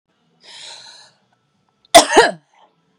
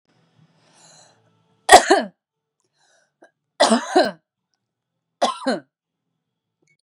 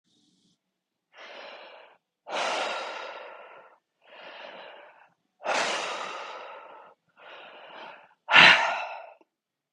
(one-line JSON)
{"cough_length": "3.0 s", "cough_amplitude": 32768, "cough_signal_mean_std_ratio": 0.25, "three_cough_length": "6.8 s", "three_cough_amplitude": 32768, "three_cough_signal_mean_std_ratio": 0.25, "exhalation_length": "9.7 s", "exhalation_amplitude": 24602, "exhalation_signal_mean_std_ratio": 0.32, "survey_phase": "beta (2021-08-13 to 2022-03-07)", "age": "18-44", "gender": "Female", "wearing_mask": "No", "symptom_cough_any": true, "symptom_runny_or_blocked_nose": true, "symptom_fatigue": true, "symptom_onset": "4 days", "smoker_status": "Ex-smoker", "respiratory_condition_asthma": false, "respiratory_condition_other": false, "recruitment_source": "Test and Trace", "submission_delay": "1 day", "covid_test_result": "Positive", "covid_test_method": "RT-qPCR", "covid_ct_value": 24.7, "covid_ct_gene": "ORF1ab gene", "covid_ct_mean": 24.9, "covid_viral_load": "7000 copies/ml", "covid_viral_load_category": "Minimal viral load (< 10K copies/ml)"}